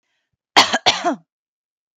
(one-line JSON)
{"cough_length": "2.0 s", "cough_amplitude": 32768, "cough_signal_mean_std_ratio": 0.33, "survey_phase": "beta (2021-08-13 to 2022-03-07)", "age": "18-44", "gender": "Female", "wearing_mask": "No", "symptom_none": true, "smoker_status": "Never smoked", "respiratory_condition_asthma": false, "respiratory_condition_other": false, "recruitment_source": "REACT", "submission_delay": "5 days", "covid_test_result": "Negative", "covid_test_method": "RT-qPCR"}